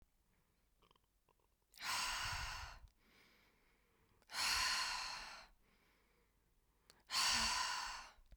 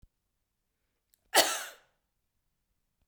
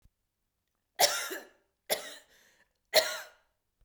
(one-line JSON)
{"exhalation_length": "8.4 s", "exhalation_amplitude": 1840, "exhalation_signal_mean_std_ratio": 0.49, "cough_length": "3.1 s", "cough_amplitude": 14189, "cough_signal_mean_std_ratio": 0.21, "three_cough_length": "3.8 s", "three_cough_amplitude": 12694, "three_cough_signal_mean_std_ratio": 0.29, "survey_phase": "beta (2021-08-13 to 2022-03-07)", "age": "18-44", "gender": "Female", "wearing_mask": "No", "symptom_fatigue": true, "symptom_onset": "12 days", "smoker_status": "Never smoked", "respiratory_condition_asthma": false, "respiratory_condition_other": false, "recruitment_source": "REACT", "submission_delay": "0 days", "covid_test_result": "Negative", "covid_test_method": "RT-qPCR", "influenza_a_test_result": "Negative", "influenza_b_test_result": "Negative"}